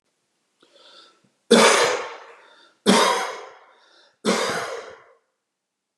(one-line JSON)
{"three_cough_length": "6.0 s", "three_cough_amplitude": 29027, "three_cough_signal_mean_std_ratio": 0.39, "survey_phase": "beta (2021-08-13 to 2022-03-07)", "age": "45-64", "gender": "Male", "wearing_mask": "No", "symptom_none": true, "smoker_status": "Never smoked", "respiratory_condition_asthma": false, "respiratory_condition_other": false, "recruitment_source": "REACT", "submission_delay": "2 days", "covid_test_result": "Negative", "covid_test_method": "RT-qPCR", "influenza_a_test_result": "Negative", "influenza_b_test_result": "Negative"}